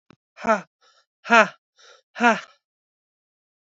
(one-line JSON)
{"exhalation_length": "3.7 s", "exhalation_amplitude": 27466, "exhalation_signal_mean_std_ratio": 0.26, "survey_phase": "beta (2021-08-13 to 2022-03-07)", "age": "18-44", "gender": "Female", "wearing_mask": "No", "symptom_cough_any": true, "symptom_runny_or_blocked_nose": true, "symptom_sore_throat": true, "symptom_headache": true, "symptom_onset": "3 days", "smoker_status": "Never smoked", "respiratory_condition_asthma": false, "respiratory_condition_other": false, "recruitment_source": "Test and Trace", "submission_delay": "1 day", "covid_test_result": "Negative", "covid_test_method": "ePCR"}